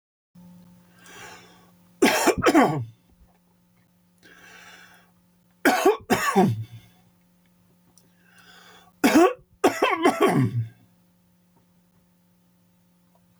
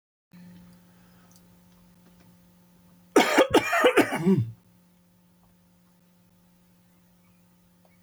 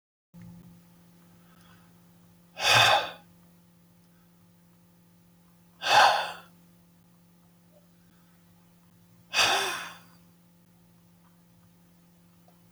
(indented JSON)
{
  "three_cough_length": "13.4 s",
  "three_cough_amplitude": 15617,
  "three_cough_signal_mean_std_ratio": 0.37,
  "cough_length": "8.0 s",
  "cough_amplitude": 16537,
  "cough_signal_mean_std_ratio": 0.31,
  "exhalation_length": "12.7 s",
  "exhalation_amplitude": 14957,
  "exhalation_signal_mean_std_ratio": 0.28,
  "survey_phase": "alpha (2021-03-01 to 2021-08-12)",
  "age": "65+",
  "gender": "Male",
  "wearing_mask": "No",
  "symptom_cough_any": true,
  "symptom_shortness_of_breath": true,
  "smoker_status": "Ex-smoker",
  "respiratory_condition_asthma": false,
  "respiratory_condition_other": false,
  "recruitment_source": "REACT",
  "submission_delay": "2 days",
  "covid_test_result": "Negative",
  "covid_test_method": "RT-qPCR"
}